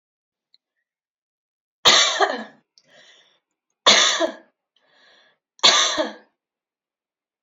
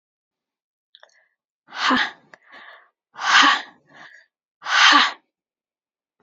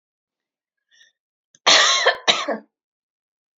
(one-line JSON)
{"three_cough_length": "7.4 s", "three_cough_amplitude": 31238, "three_cough_signal_mean_std_ratio": 0.33, "exhalation_length": "6.2 s", "exhalation_amplitude": 29537, "exhalation_signal_mean_std_ratio": 0.34, "cough_length": "3.6 s", "cough_amplitude": 32080, "cough_signal_mean_std_ratio": 0.34, "survey_phase": "beta (2021-08-13 to 2022-03-07)", "age": "45-64", "gender": "Female", "wearing_mask": "No", "symptom_none": true, "smoker_status": "Never smoked", "respiratory_condition_asthma": false, "respiratory_condition_other": false, "recruitment_source": "REACT", "submission_delay": "2 days", "covid_test_result": "Negative", "covid_test_method": "RT-qPCR"}